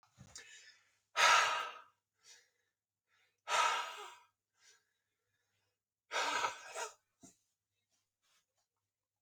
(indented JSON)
{
  "exhalation_length": "9.2 s",
  "exhalation_amplitude": 5526,
  "exhalation_signal_mean_std_ratio": 0.31,
  "survey_phase": "beta (2021-08-13 to 2022-03-07)",
  "age": "18-44",
  "gender": "Male",
  "wearing_mask": "No",
  "symptom_none": true,
  "smoker_status": "Ex-smoker",
  "respiratory_condition_asthma": false,
  "respiratory_condition_other": false,
  "recruitment_source": "REACT",
  "submission_delay": "8 days",
  "covid_test_method": "RT-qPCR"
}